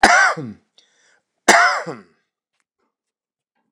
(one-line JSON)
{"cough_length": "3.7 s", "cough_amplitude": 29204, "cough_signal_mean_std_ratio": 0.35, "survey_phase": "alpha (2021-03-01 to 2021-08-12)", "age": "65+", "gender": "Male", "wearing_mask": "No", "symptom_cough_any": true, "symptom_fatigue": true, "smoker_status": "Never smoked", "respiratory_condition_asthma": false, "respiratory_condition_other": false, "recruitment_source": "REACT", "submission_delay": "1 day", "covid_test_result": "Negative", "covid_test_method": "RT-qPCR"}